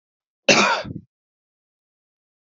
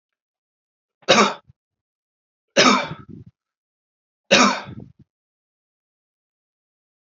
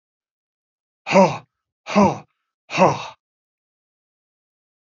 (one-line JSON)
{"cough_length": "2.6 s", "cough_amplitude": 27422, "cough_signal_mean_std_ratio": 0.29, "three_cough_length": "7.1 s", "three_cough_amplitude": 29203, "three_cough_signal_mean_std_ratio": 0.27, "exhalation_length": "4.9 s", "exhalation_amplitude": 28010, "exhalation_signal_mean_std_ratio": 0.28, "survey_phase": "beta (2021-08-13 to 2022-03-07)", "age": "45-64", "gender": "Male", "wearing_mask": "No", "symptom_none": true, "smoker_status": "Never smoked", "respiratory_condition_asthma": true, "respiratory_condition_other": false, "recruitment_source": "REACT", "submission_delay": "2 days", "covid_test_result": "Negative", "covid_test_method": "RT-qPCR"}